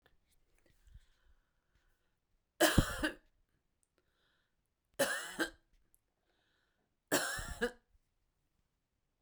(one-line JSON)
{"three_cough_length": "9.2 s", "three_cough_amplitude": 7664, "three_cough_signal_mean_std_ratio": 0.27, "survey_phase": "beta (2021-08-13 to 2022-03-07)", "age": "65+", "gender": "Female", "wearing_mask": "No", "symptom_none": true, "smoker_status": "Ex-smoker", "respiratory_condition_asthma": false, "respiratory_condition_other": false, "recruitment_source": "REACT", "submission_delay": "0 days", "covid_test_result": "Negative", "covid_test_method": "RT-qPCR"}